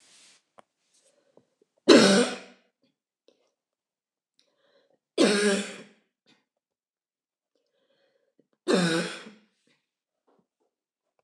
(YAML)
three_cough_length: 11.2 s
three_cough_amplitude: 25001
three_cough_signal_mean_std_ratio: 0.26
survey_phase: beta (2021-08-13 to 2022-03-07)
age: 45-64
gender: Female
wearing_mask: 'No'
symptom_none: true
smoker_status: Never smoked
respiratory_condition_asthma: false
respiratory_condition_other: false
recruitment_source: REACT
submission_delay: 1 day
covid_test_result: Negative
covid_test_method: RT-qPCR
influenza_a_test_result: Negative
influenza_b_test_result: Negative